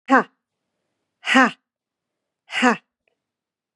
{"exhalation_length": "3.8 s", "exhalation_amplitude": 31166, "exhalation_signal_mean_std_ratio": 0.28, "survey_phase": "beta (2021-08-13 to 2022-03-07)", "age": "45-64", "gender": "Female", "wearing_mask": "No", "symptom_none": true, "smoker_status": "Never smoked", "respiratory_condition_asthma": false, "respiratory_condition_other": false, "recruitment_source": "Test and Trace", "submission_delay": "2 days", "covid_test_result": "Negative", "covid_test_method": "RT-qPCR"}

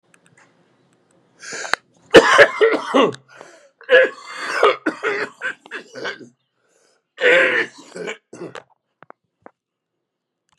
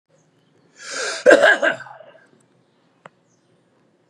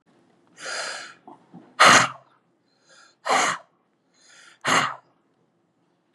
{"three_cough_length": "10.6 s", "three_cough_amplitude": 32768, "three_cough_signal_mean_std_ratio": 0.35, "cough_length": "4.1 s", "cough_amplitude": 32767, "cough_signal_mean_std_ratio": 0.3, "exhalation_length": "6.1 s", "exhalation_amplitude": 30882, "exhalation_signal_mean_std_ratio": 0.31, "survey_phase": "beta (2021-08-13 to 2022-03-07)", "age": "45-64", "gender": "Male", "wearing_mask": "No", "symptom_cough_any": true, "symptom_new_continuous_cough": true, "symptom_runny_or_blocked_nose": true, "symptom_shortness_of_breath": true, "symptom_sore_throat": true, "symptom_fatigue": true, "symptom_onset": "5 days", "smoker_status": "Current smoker (11 or more cigarettes per day)", "respiratory_condition_asthma": false, "respiratory_condition_other": false, "recruitment_source": "REACT", "submission_delay": "1 day", "covid_test_result": "Negative", "covid_test_method": "RT-qPCR", "influenza_a_test_result": "Negative", "influenza_b_test_result": "Negative"}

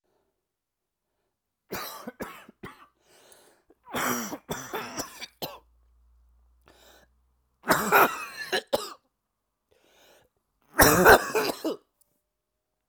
{"three_cough_length": "12.9 s", "three_cough_amplitude": 25328, "three_cough_signal_mean_std_ratio": 0.29, "survey_phase": "alpha (2021-03-01 to 2021-08-12)", "age": "18-44", "gender": "Male", "wearing_mask": "No", "symptom_cough_any": true, "symptom_new_continuous_cough": true, "symptom_shortness_of_breath": true, "symptom_diarrhoea": true, "symptom_fatigue": true, "symptom_fever_high_temperature": true, "symptom_headache": true, "symptom_change_to_sense_of_smell_or_taste": true, "symptom_loss_of_taste": true, "symptom_onset": "5 days", "smoker_status": "Never smoked", "respiratory_condition_asthma": false, "respiratory_condition_other": false, "recruitment_source": "Test and Trace", "submission_delay": "2 days", "covid_test_result": "Positive", "covid_test_method": "ePCR"}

